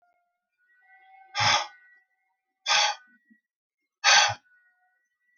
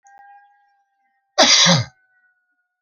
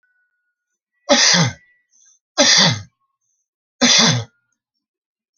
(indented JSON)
{
  "exhalation_length": "5.4 s",
  "exhalation_amplitude": 19689,
  "exhalation_signal_mean_std_ratio": 0.32,
  "cough_length": "2.8 s",
  "cough_amplitude": 32767,
  "cough_signal_mean_std_ratio": 0.34,
  "three_cough_length": "5.4 s",
  "three_cough_amplitude": 32768,
  "three_cough_signal_mean_std_ratio": 0.4,
  "survey_phase": "beta (2021-08-13 to 2022-03-07)",
  "age": "65+",
  "gender": "Male",
  "wearing_mask": "No",
  "symptom_none": true,
  "smoker_status": "Ex-smoker",
  "respiratory_condition_asthma": false,
  "respiratory_condition_other": false,
  "recruitment_source": "REACT",
  "submission_delay": "1 day",
  "covid_test_result": "Negative",
  "covid_test_method": "RT-qPCR"
}